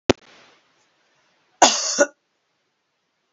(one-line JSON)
{"cough_length": "3.3 s", "cough_amplitude": 30226, "cough_signal_mean_std_ratio": 0.24, "survey_phase": "beta (2021-08-13 to 2022-03-07)", "age": "65+", "gender": "Female", "wearing_mask": "No", "symptom_none": true, "smoker_status": "Ex-smoker", "respiratory_condition_asthma": true, "respiratory_condition_other": false, "recruitment_source": "Test and Trace", "submission_delay": "1 day", "covid_test_result": "Negative", "covid_test_method": "RT-qPCR"}